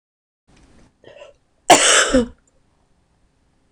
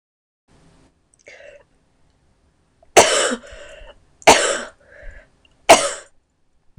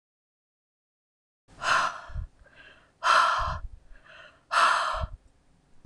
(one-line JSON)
{"cough_length": "3.7 s", "cough_amplitude": 26028, "cough_signal_mean_std_ratio": 0.3, "three_cough_length": "6.8 s", "three_cough_amplitude": 26028, "three_cough_signal_mean_std_ratio": 0.28, "exhalation_length": "5.9 s", "exhalation_amplitude": 12553, "exhalation_signal_mean_std_ratio": 0.43, "survey_phase": "beta (2021-08-13 to 2022-03-07)", "age": "18-44", "gender": "Female", "wearing_mask": "No", "symptom_cough_any": true, "symptom_runny_or_blocked_nose": true, "symptom_shortness_of_breath": true, "symptom_sore_throat": true, "symptom_fatigue": true, "symptom_fever_high_temperature": true, "symptom_headache": true, "symptom_other": true, "symptom_onset": "3 days", "smoker_status": "Never smoked", "respiratory_condition_asthma": false, "respiratory_condition_other": false, "recruitment_source": "Test and Trace", "submission_delay": "2 days", "covid_test_result": "Positive", "covid_test_method": "RT-qPCR"}